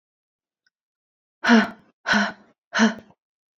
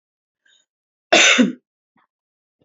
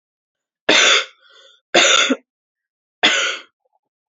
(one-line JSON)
{"exhalation_length": "3.6 s", "exhalation_amplitude": 23818, "exhalation_signal_mean_std_ratio": 0.33, "cough_length": "2.6 s", "cough_amplitude": 29755, "cough_signal_mean_std_ratio": 0.31, "three_cough_length": "4.2 s", "three_cough_amplitude": 31725, "three_cough_signal_mean_std_ratio": 0.41, "survey_phase": "beta (2021-08-13 to 2022-03-07)", "age": "18-44", "gender": "Female", "wearing_mask": "No", "symptom_cough_any": true, "symptom_new_continuous_cough": true, "symptom_runny_or_blocked_nose": true, "symptom_shortness_of_breath": true, "symptom_fatigue": true, "symptom_other": true, "symptom_onset": "2 days", "smoker_status": "Never smoked", "respiratory_condition_asthma": false, "respiratory_condition_other": false, "recruitment_source": "Test and Trace", "submission_delay": "1 day", "covid_test_result": "Positive", "covid_test_method": "RT-qPCR", "covid_ct_value": 24.1, "covid_ct_gene": "ORF1ab gene"}